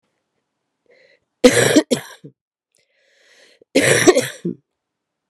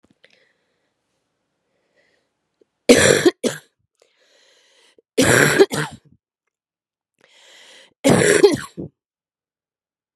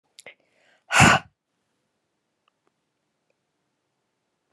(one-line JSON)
{"cough_length": "5.3 s", "cough_amplitude": 32768, "cough_signal_mean_std_ratio": 0.33, "three_cough_length": "10.2 s", "three_cough_amplitude": 32768, "three_cough_signal_mean_std_ratio": 0.31, "exhalation_length": "4.5 s", "exhalation_amplitude": 26681, "exhalation_signal_mean_std_ratio": 0.19, "survey_phase": "beta (2021-08-13 to 2022-03-07)", "age": "18-44", "gender": "Female", "wearing_mask": "No", "symptom_cough_any": true, "symptom_runny_or_blocked_nose": true, "symptom_sore_throat": true, "symptom_abdominal_pain": true, "symptom_diarrhoea": true, "symptom_fatigue": true, "symptom_fever_high_temperature": true, "symptom_headache": true, "symptom_change_to_sense_of_smell_or_taste": true, "symptom_loss_of_taste": true, "symptom_onset": "8 days", "smoker_status": "Never smoked", "respiratory_condition_asthma": false, "respiratory_condition_other": false, "recruitment_source": "Test and Trace", "submission_delay": "1 day", "covid_test_result": "Positive", "covid_test_method": "RT-qPCR", "covid_ct_value": 17.1, "covid_ct_gene": "ORF1ab gene"}